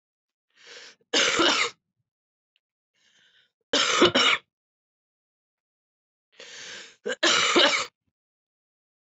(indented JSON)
{
  "three_cough_length": "9.0 s",
  "three_cough_amplitude": 16887,
  "three_cough_signal_mean_std_ratio": 0.37,
  "survey_phase": "beta (2021-08-13 to 2022-03-07)",
  "age": "18-44",
  "gender": "Female",
  "wearing_mask": "Yes",
  "symptom_cough_any": true,
  "symptom_runny_or_blocked_nose": true,
  "symptom_sore_throat": true,
  "symptom_fatigue": true,
  "symptom_headache": true,
  "symptom_change_to_sense_of_smell_or_taste": true,
  "smoker_status": "Current smoker (11 or more cigarettes per day)",
  "respiratory_condition_asthma": true,
  "respiratory_condition_other": false,
  "recruitment_source": "Test and Trace",
  "submission_delay": "3 days",
  "covid_test_result": "Positive",
  "covid_test_method": "RT-qPCR",
  "covid_ct_value": 31.8,
  "covid_ct_gene": "ORF1ab gene",
  "covid_ct_mean": 32.8,
  "covid_viral_load": "17 copies/ml",
  "covid_viral_load_category": "Minimal viral load (< 10K copies/ml)"
}